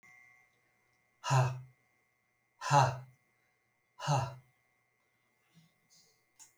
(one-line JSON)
{"exhalation_length": "6.6 s", "exhalation_amplitude": 6343, "exhalation_signal_mean_std_ratio": 0.3, "survey_phase": "alpha (2021-03-01 to 2021-08-12)", "age": "65+", "gender": "Male", "wearing_mask": "No", "symptom_none": true, "smoker_status": "Never smoked", "respiratory_condition_asthma": false, "respiratory_condition_other": false, "recruitment_source": "REACT", "submission_delay": "1 day", "covid_test_result": "Negative", "covid_test_method": "RT-qPCR"}